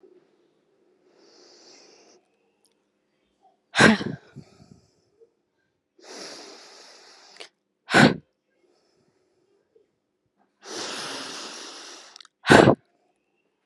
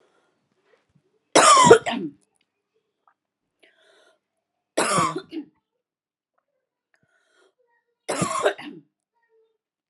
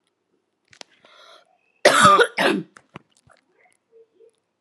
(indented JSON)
{
  "exhalation_length": "13.7 s",
  "exhalation_amplitude": 32768,
  "exhalation_signal_mean_std_ratio": 0.22,
  "three_cough_length": "9.9 s",
  "three_cough_amplitude": 32767,
  "three_cough_signal_mean_std_ratio": 0.27,
  "cough_length": "4.6 s",
  "cough_amplitude": 32713,
  "cough_signal_mean_std_ratio": 0.3,
  "survey_phase": "alpha (2021-03-01 to 2021-08-12)",
  "age": "18-44",
  "gender": "Female",
  "wearing_mask": "No",
  "symptom_none": true,
  "smoker_status": "Never smoked",
  "respiratory_condition_asthma": false,
  "respiratory_condition_other": false,
  "recruitment_source": "REACT",
  "submission_delay": "12 days",
  "covid_test_result": "Negative",
  "covid_test_method": "RT-qPCR"
}